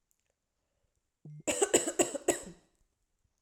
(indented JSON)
{
  "three_cough_length": "3.4 s",
  "three_cough_amplitude": 11398,
  "three_cough_signal_mean_std_ratio": 0.32,
  "survey_phase": "alpha (2021-03-01 to 2021-08-12)",
  "age": "18-44",
  "gender": "Female",
  "wearing_mask": "No",
  "symptom_none": true,
  "smoker_status": "Ex-smoker",
  "respiratory_condition_asthma": false,
  "respiratory_condition_other": false,
  "recruitment_source": "REACT",
  "submission_delay": "1 day",
  "covid_test_result": "Negative",
  "covid_test_method": "RT-qPCR"
}